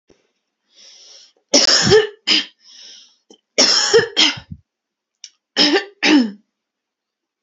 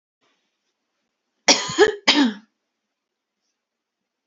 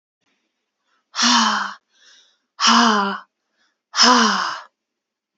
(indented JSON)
{
  "three_cough_length": "7.4 s",
  "three_cough_amplitude": 32768,
  "three_cough_signal_mean_std_ratio": 0.42,
  "cough_length": "4.3 s",
  "cough_amplitude": 29788,
  "cough_signal_mean_std_ratio": 0.28,
  "exhalation_length": "5.4 s",
  "exhalation_amplitude": 30313,
  "exhalation_signal_mean_std_ratio": 0.45,
  "survey_phase": "beta (2021-08-13 to 2022-03-07)",
  "age": "18-44",
  "gender": "Female",
  "wearing_mask": "No",
  "symptom_cough_any": true,
  "symptom_runny_or_blocked_nose": true,
  "symptom_headache": true,
  "symptom_onset": "7 days",
  "smoker_status": "Never smoked",
  "respiratory_condition_asthma": false,
  "respiratory_condition_other": false,
  "recruitment_source": "REACT",
  "submission_delay": "3 days",
  "covid_test_result": "Negative",
  "covid_test_method": "RT-qPCR",
  "influenza_a_test_result": "Negative",
  "influenza_b_test_result": "Negative"
}